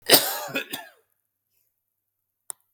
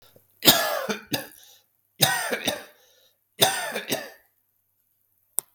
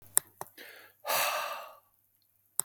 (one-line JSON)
{"cough_length": "2.7 s", "cough_amplitude": 32768, "cough_signal_mean_std_ratio": 0.26, "three_cough_length": "5.5 s", "three_cough_amplitude": 32768, "three_cough_signal_mean_std_ratio": 0.37, "exhalation_length": "2.6 s", "exhalation_amplitude": 32768, "exhalation_signal_mean_std_ratio": 0.35, "survey_phase": "beta (2021-08-13 to 2022-03-07)", "age": "45-64", "gender": "Male", "wearing_mask": "No", "symptom_none": true, "smoker_status": "Never smoked", "respiratory_condition_asthma": false, "respiratory_condition_other": false, "recruitment_source": "REACT", "submission_delay": "0 days", "covid_test_result": "Negative", "covid_test_method": "RT-qPCR", "influenza_a_test_result": "Negative", "influenza_b_test_result": "Negative"}